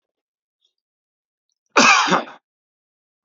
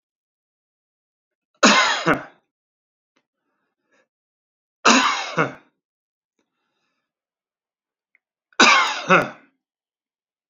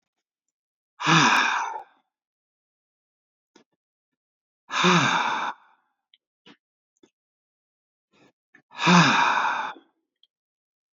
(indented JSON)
{
  "cough_length": "3.2 s",
  "cough_amplitude": 29341,
  "cough_signal_mean_std_ratio": 0.29,
  "three_cough_length": "10.5 s",
  "three_cough_amplitude": 30179,
  "three_cough_signal_mean_std_ratio": 0.29,
  "exhalation_length": "10.9 s",
  "exhalation_amplitude": 20184,
  "exhalation_signal_mean_std_ratio": 0.36,
  "survey_phase": "beta (2021-08-13 to 2022-03-07)",
  "age": "45-64",
  "gender": "Male",
  "wearing_mask": "No",
  "symptom_none": true,
  "smoker_status": "Ex-smoker",
  "respiratory_condition_asthma": false,
  "respiratory_condition_other": false,
  "recruitment_source": "REACT",
  "submission_delay": "3 days",
  "covid_test_result": "Negative",
  "covid_test_method": "RT-qPCR",
  "influenza_a_test_result": "Unknown/Void",
  "influenza_b_test_result": "Unknown/Void"
}